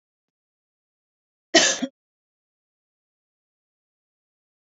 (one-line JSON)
{"cough_length": "4.8 s", "cough_amplitude": 27289, "cough_signal_mean_std_ratio": 0.17, "survey_phase": "beta (2021-08-13 to 2022-03-07)", "age": "45-64", "gender": "Female", "wearing_mask": "No", "symptom_sore_throat": true, "symptom_abdominal_pain": true, "symptom_fatigue": true, "smoker_status": "Never smoked", "respiratory_condition_asthma": false, "respiratory_condition_other": false, "recruitment_source": "REACT", "submission_delay": "1 day", "covid_test_result": "Negative", "covid_test_method": "RT-qPCR"}